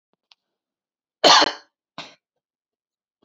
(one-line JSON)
{"cough_length": "3.2 s", "cough_amplitude": 29523, "cough_signal_mean_std_ratio": 0.23, "survey_phase": "beta (2021-08-13 to 2022-03-07)", "age": "18-44", "gender": "Female", "wearing_mask": "No", "symptom_runny_or_blocked_nose": true, "symptom_shortness_of_breath": true, "symptom_sore_throat": true, "symptom_diarrhoea": true, "symptom_fatigue": true, "symptom_headache": true, "symptom_onset": "4 days", "smoker_status": "Never smoked", "respiratory_condition_asthma": false, "respiratory_condition_other": false, "recruitment_source": "Test and Trace", "submission_delay": "1 day", "covid_test_result": "Positive", "covid_test_method": "RT-qPCR", "covid_ct_value": 19.8, "covid_ct_gene": "ORF1ab gene", "covid_ct_mean": 20.9, "covid_viral_load": "140000 copies/ml", "covid_viral_load_category": "Low viral load (10K-1M copies/ml)"}